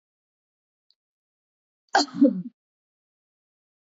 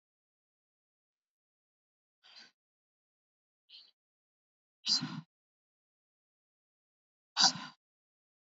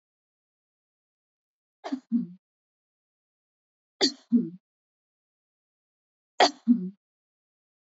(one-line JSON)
{"cough_length": "3.9 s", "cough_amplitude": 14244, "cough_signal_mean_std_ratio": 0.21, "exhalation_length": "8.5 s", "exhalation_amplitude": 9145, "exhalation_signal_mean_std_ratio": 0.17, "three_cough_length": "7.9 s", "three_cough_amplitude": 14141, "three_cough_signal_mean_std_ratio": 0.23, "survey_phase": "beta (2021-08-13 to 2022-03-07)", "age": "45-64", "gender": "Female", "wearing_mask": "No", "symptom_none": true, "smoker_status": "Never smoked", "respiratory_condition_asthma": false, "respiratory_condition_other": false, "recruitment_source": "Test and Trace", "submission_delay": "1 day", "covid_test_result": "Positive", "covid_test_method": "RT-qPCR", "covid_ct_value": 19.3, "covid_ct_gene": "ORF1ab gene"}